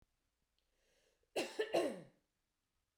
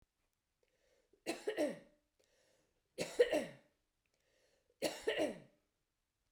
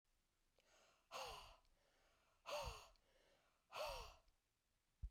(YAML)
cough_length: 3.0 s
cough_amplitude: 2221
cough_signal_mean_std_ratio: 0.32
three_cough_length: 6.3 s
three_cough_amplitude: 3948
three_cough_signal_mean_std_ratio: 0.32
exhalation_length: 5.1 s
exhalation_amplitude: 405
exhalation_signal_mean_std_ratio: 0.43
survey_phase: beta (2021-08-13 to 2022-03-07)
age: 45-64
gender: Female
wearing_mask: 'No'
symptom_none: true
smoker_status: Ex-smoker
respiratory_condition_asthma: true
respiratory_condition_other: false
recruitment_source: REACT
submission_delay: 3 days
covid_test_result: Negative
covid_test_method: RT-qPCR